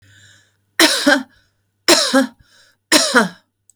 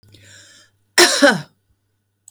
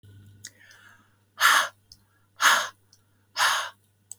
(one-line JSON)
{"three_cough_length": "3.8 s", "three_cough_amplitude": 32768, "three_cough_signal_mean_std_ratio": 0.44, "cough_length": "2.3 s", "cough_amplitude": 32768, "cough_signal_mean_std_ratio": 0.32, "exhalation_length": "4.2 s", "exhalation_amplitude": 18019, "exhalation_signal_mean_std_ratio": 0.36, "survey_phase": "beta (2021-08-13 to 2022-03-07)", "age": "45-64", "gender": "Female", "wearing_mask": "No", "symptom_fatigue": true, "smoker_status": "Never smoked", "respiratory_condition_asthma": false, "respiratory_condition_other": false, "recruitment_source": "REACT", "submission_delay": "2 days", "covid_test_result": "Negative", "covid_test_method": "RT-qPCR", "influenza_a_test_result": "Negative", "influenza_b_test_result": "Negative"}